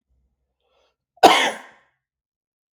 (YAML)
cough_length: 2.7 s
cough_amplitude: 32768
cough_signal_mean_std_ratio: 0.23
survey_phase: beta (2021-08-13 to 2022-03-07)
age: 45-64
gender: Male
wearing_mask: 'No'
symptom_none: true
smoker_status: Never smoked
respiratory_condition_asthma: false
respiratory_condition_other: false
recruitment_source: REACT
submission_delay: 1 day
covid_test_result: Negative
covid_test_method: RT-qPCR